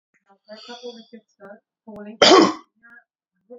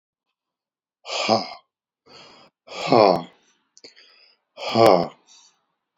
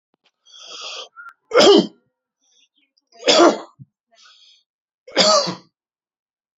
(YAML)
cough_length: 3.6 s
cough_amplitude: 32767
cough_signal_mean_std_ratio: 0.27
exhalation_length: 6.0 s
exhalation_amplitude: 26246
exhalation_signal_mean_std_ratio: 0.31
three_cough_length: 6.6 s
three_cough_amplitude: 31890
three_cough_signal_mean_std_ratio: 0.33
survey_phase: beta (2021-08-13 to 2022-03-07)
age: 45-64
gender: Male
wearing_mask: 'No'
symptom_none: true
smoker_status: Never smoked
respiratory_condition_asthma: false
respiratory_condition_other: false
recruitment_source: REACT
submission_delay: 2 days
covid_test_result: Negative
covid_test_method: RT-qPCR